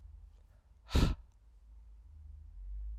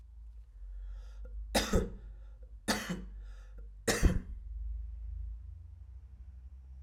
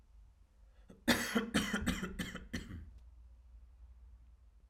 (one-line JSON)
{"exhalation_length": "3.0 s", "exhalation_amplitude": 5242, "exhalation_signal_mean_std_ratio": 0.4, "three_cough_length": "6.8 s", "three_cough_amplitude": 6918, "three_cough_signal_mean_std_ratio": 0.59, "cough_length": "4.7 s", "cough_amplitude": 5295, "cough_signal_mean_std_ratio": 0.48, "survey_phase": "alpha (2021-03-01 to 2021-08-12)", "age": "18-44", "gender": "Male", "wearing_mask": "No", "symptom_cough_any": true, "symptom_fatigue": true, "symptom_headache": true, "symptom_loss_of_taste": true, "symptom_onset": "3 days", "smoker_status": "Never smoked", "respiratory_condition_asthma": false, "respiratory_condition_other": false, "recruitment_source": "Test and Trace", "submission_delay": "2 days", "covid_test_result": "Positive", "covid_test_method": "RT-qPCR", "covid_ct_value": 18.4, "covid_ct_gene": "ORF1ab gene", "covid_ct_mean": 18.5, "covid_viral_load": "850000 copies/ml", "covid_viral_load_category": "Low viral load (10K-1M copies/ml)"}